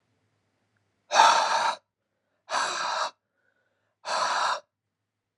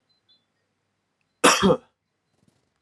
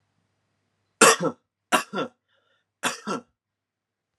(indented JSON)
{
  "exhalation_length": "5.4 s",
  "exhalation_amplitude": 22873,
  "exhalation_signal_mean_std_ratio": 0.43,
  "cough_length": "2.8 s",
  "cough_amplitude": 29354,
  "cough_signal_mean_std_ratio": 0.26,
  "three_cough_length": "4.2 s",
  "three_cough_amplitude": 28475,
  "three_cough_signal_mean_std_ratio": 0.27,
  "survey_phase": "alpha (2021-03-01 to 2021-08-12)",
  "age": "18-44",
  "gender": "Male",
  "wearing_mask": "No",
  "symptom_none": true,
  "smoker_status": "Never smoked",
  "respiratory_condition_asthma": false,
  "respiratory_condition_other": false,
  "recruitment_source": "Test and Trace",
  "submission_delay": "2 days",
  "covid_test_result": "Positive",
  "covid_test_method": "RT-qPCR",
  "covid_ct_value": 15.7,
  "covid_ct_gene": "N gene",
  "covid_ct_mean": 16.0,
  "covid_viral_load": "5600000 copies/ml",
  "covid_viral_load_category": "High viral load (>1M copies/ml)"
}